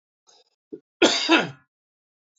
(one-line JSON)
{"cough_length": "2.4 s", "cough_amplitude": 22134, "cough_signal_mean_std_ratio": 0.32, "survey_phase": "beta (2021-08-13 to 2022-03-07)", "age": "45-64", "gender": "Male", "wearing_mask": "No", "symptom_none": true, "smoker_status": "Ex-smoker", "respiratory_condition_asthma": false, "respiratory_condition_other": false, "recruitment_source": "REACT", "submission_delay": "1 day", "covid_test_result": "Negative", "covid_test_method": "RT-qPCR", "influenza_a_test_result": "Negative", "influenza_b_test_result": "Negative"}